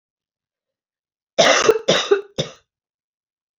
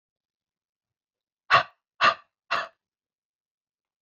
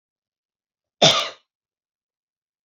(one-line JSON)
{"three_cough_length": "3.6 s", "three_cough_amplitude": 28797, "three_cough_signal_mean_std_ratio": 0.34, "exhalation_length": "4.0 s", "exhalation_amplitude": 17174, "exhalation_signal_mean_std_ratio": 0.22, "cough_length": "2.6 s", "cough_amplitude": 32177, "cough_signal_mean_std_ratio": 0.22, "survey_phase": "beta (2021-08-13 to 2022-03-07)", "age": "18-44", "gender": "Female", "wearing_mask": "No", "symptom_cough_any": true, "symptom_runny_or_blocked_nose": true, "symptom_fatigue": true, "symptom_change_to_sense_of_smell_or_taste": true, "symptom_loss_of_taste": true, "symptom_onset": "2 days", "smoker_status": "Never smoked", "respiratory_condition_asthma": false, "respiratory_condition_other": false, "recruitment_source": "Test and Trace", "submission_delay": "1 day", "covid_test_result": "Positive", "covid_test_method": "RT-qPCR"}